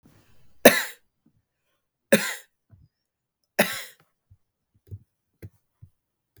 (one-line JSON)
{"three_cough_length": "6.4 s", "three_cough_amplitude": 32768, "three_cough_signal_mean_std_ratio": 0.19, "survey_phase": "beta (2021-08-13 to 2022-03-07)", "age": "45-64", "gender": "Male", "wearing_mask": "No", "symptom_none": true, "smoker_status": "Ex-smoker", "respiratory_condition_asthma": true, "respiratory_condition_other": false, "recruitment_source": "Test and Trace", "submission_delay": "1 day", "covid_test_result": "Positive", "covid_test_method": "ePCR"}